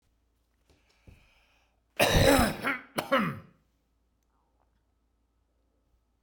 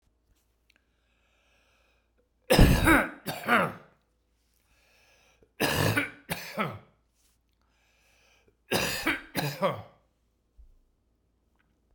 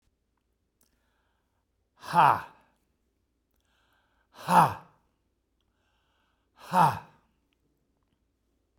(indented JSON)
{
  "cough_length": "6.2 s",
  "cough_amplitude": 11751,
  "cough_signal_mean_std_ratio": 0.31,
  "three_cough_length": "11.9 s",
  "three_cough_amplitude": 20772,
  "three_cough_signal_mean_std_ratio": 0.33,
  "exhalation_length": "8.8 s",
  "exhalation_amplitude": 14616,
  "exhalation_signal_mean_std_ratio": 0.23,
  "survey_phase": "beta (2021-08-13 to 2022-03-07)",
  "age": "65+",
  "gender": "Male",
  "wearing_mask": "No",
  "symptom_none": true,
  "symptom_onset": "5 days",
  "smoker_status": "Never smoked",
  "respiratory_condition_asthma": false,
  "respiratory_condition_other": false,
  "recruitment_source": "REACT",
  "submission_delay": "2 days",
  "covid_test_result": "Negative",
  "covid_test_method": "RT-qPCR"
}